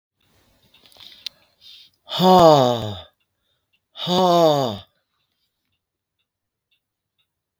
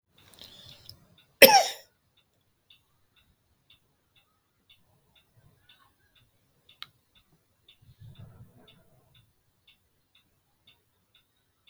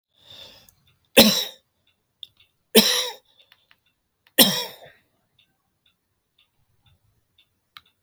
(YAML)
exhalation_length: 7.6 s
exhalation_amplitude: 30938
exhalation_signal_mean_std_ratio: 0.34
cough_length: 11.7 s
cough_amplitude: 32767
cough_signal_mean_std_ratio: 0.12
three_cough_length: 8.0 s
three_cough_amplitude: 32768
three_cough_signal_mean_std_ratio: 0.23
survey_phase: beta (2021-08-13 to 2022-03-07)
age: 65+
gender: Male
wearing_mask: 'No'
symptom_none: true
smoker_status: Never smoked
respiratory_condition_asthma: false
respiratory_condition_other: false
recruitment_source: REACT
submission_delay: 1 day
covid_test_result: Negative
covid_test_method: RT-qPCR
influenza_a_test_result: Negative
influenza_b_test_result: Negative